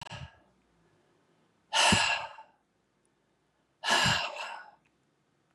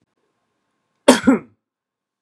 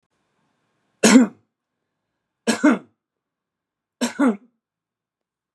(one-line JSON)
{"exhalation_length": "5.5 s", "exhalation_amplitude": 8982, "exhalation_signal_mean_std_ratio": 0.37, "cough_length": "2.2 s", "cough_amplitude": 32768, "cough_signal_mean_std_ratio": 0.24, "three_cough_length": "5.5 s", "three_cough_amplitude": 31471, "three_cough_signal_mean_std_ratio": 0.28, "survey_phase": "beta (2021-08-13 to 2022-03-07)", "age": "45-64", "gender": "Male", "wearing_mask": "No", "symptom_none": true, "smoker_status": "Never smoked", "respiratory_condition_asthma": false, "respiratory_condition_other": false, "recruitment_source": "REACT", "submission_delay": "1 day", "covid_test_result": "Negative", "covid_test_method": "RT-qPCR", "influenza_a_test_result": "Negative", "influenza_b_test_result": "Negative"}